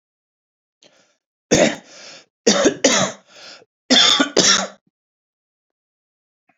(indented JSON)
{
  "three_cough_length": "6.6 s",
  "three_cough_amplitude": 32658,
  "three_cough_signal_mean_std_ratio": 0.38,
  "survey_phase": "beta (2021-08-13 to 2022-03-07)",
  "age": "45-64",
  "gender": "Male",
  "wearing_mask": "No",
  "symptom_fatigue": true,
  "symptom_headache": true,
  "symptom_loss_of_taste": true,
  "symptom_onset": "3 days",
  "smoker_status": "Ex-smoker",
  "respiratory_condition_asthma": false,
  "respiratory_condition_other": false,
  "recruitment_source": "Test and Trace",
  "submission_delay": "2 days",
  "covid_test_result": "Positive",
  "covid_test_method": "RT-qPCR",
  "covid_ct_value": 26.2,
  "covid_ct_gene": "ORF1ab gene",
  "covid_ct_mean": 27.1,
  "covid_viral_load": "1300 copies/ml",
  "covid_viral_load_category": "Minimal viral load (< 10K copies/ml)"
}